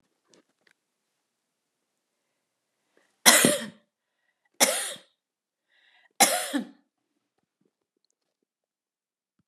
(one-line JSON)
{"three_cough_length": "9.5 s", "three_cough_amplitude": 31920, "three_cough_signal_mean_std_ratio": 0.22, "survey_phase": "beta (2021-08-13 to 2022-03-07)", "age": "65+", "gender": "Female", "wearing_mask": "No", "symptom_none": true, "smoker_status": "Ex-smoker", "respiratory_condition_asthma": false, "respiratory_condition_other": false, "recruitment_source": "REACT", "submission_delay": "1 day", "covid_test_result": "Negative", "covid_test_method": "RT-qPCR"}